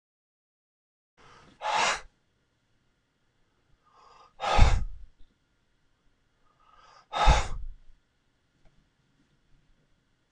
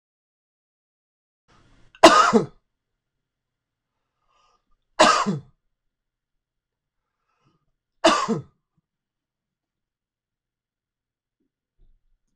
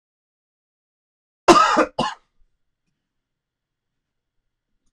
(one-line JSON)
{"exhalation_length": "10.3 s", "exhalation_amplitude": 19999, "exhalation_signal_mean_std_ratio": 0.26, "three_cough_length": "12.4 s", "three_cough_amplitude": 26028, "three_cough_signal_mean_std_ratio": 0.21, "cough_length": "4.9 s", "cough_amplitude": 26028, "cough_signal_mean_std_ratio": 0.23, "survey_phase": "beta (2021-08-13 to 2022-03-07)", "age": "45-64", "gender": "Male", "wearing_mask": "No", "symptom_fatigue": true, "symptom_fever_high_temperature": true, "symptom_change_to_sense_of_smell_or_taste": true, "symptom_onset": "2 days", "smoker_status": "Ex-smoker", "respiratory_condition_asthma": false, "respiratory_condition_other": false, "recruitment_source": "Test and Trace", "submission_delay": "2 days", "covid_test_result": "Positive", "covid_test_method": "LAMP"}